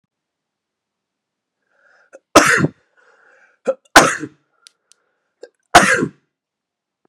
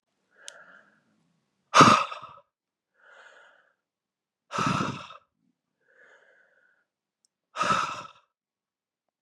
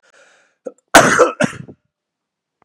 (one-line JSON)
{"three_cough_length": "7.1 s", "three_cough_amplitude": 32768, "three_cough_signal_mean_std_ratio": 0.26, "exhalation_length": "9.2 s", "exhalation_amplitude": 22182, "exhalation_signal_mean_std_ratio": 0.24, "cough_length": "2.6 s", "cough_amplitude": 32768, "cough_signal_mean_std_ratio": 0.32, "survey_phase": "beta (2021-08-13 to 2022-03-07)", "age": "18-44", "gender": "Male", "wearing_mask": "No", "symptom_cough_any": true, "symptom_new_continuous_cough": true, "symptom_runny_or_blocked_nose": true, "symptom_shortness_of_breath": true, "symptom_fatigue": true, "symptom_headache": true, "symptom_onset": "2 days", "smoker_status": "Never smoked", "respiratory_condition_asthma": false, "respiratory_condition_other": false, "recruitment_source": "Test and Trace", "submission_delay": "2 days", "covid_test_result": "Positive", "covid_test_method": "RT-qPCR", "covid_ct_value": 16.5, "covid_ct_gene": "ORF1ab gene", "covid_ct_mean": 17.2, "covid_viral_load": "2300000 copies/ml", "covid_viral_load_category": "High viral load (>1M copies/ml)"}